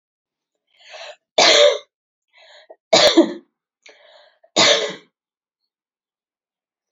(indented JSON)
{
  "three_cough_length": "6.9 s",
  "three_cough_amplitude": 31385,
  "three_cough_signal_mean_std_ratio": 0.32,
  "survey_phase": "beta (2021-08-13 to 2022-03-07)",
  "age": "18-44",
  "gender": "Female",
  "wearing_mask": "No",
  "symptom_runny_or_blocked_nose": true,
  "symptom_other": true,
  "smoker_status": "Never smoked",
  "respiratory_condition_asthma": false,
  "respiratory_condition_other": false,
  "recruitment_source": "Test and Trace",
  "submission_delay": "2 days",
  "covid_test_result": "Positive",
  "covid_test_method": "RT-qPCR",
  "covid_ct_value": 13.7,
  "covid_ct_gene": "N gene",
  "covid_ct_mean": 14.5,
  "covid_viral_load": "18000000 copies/ml",
  "covid_viral_load_category": "High viral load (>1M copies/ml)"
}